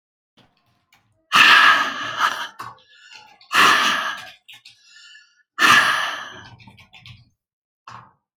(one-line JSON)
{"exhalation_length": "8.4 s", "exhalation_amplitude": 30742, "exhalation_signal_mean_std_ratio": 0.41, "survey_phase": "alpha (2021-03-01 to 2021-08-12)", "age": "45-64", "gender": "Female", "wearing_mask": "No", "symptom_none": true, "smoker_status": "Ex-smoker", "respiratory_condition_asthma": false, "respiratory_condition_other": false, "recruitment_source": "REACT", "submission_delay": "3 days", "covid_test_result": "Negative", "covid_test_method": "RT-qPCR"}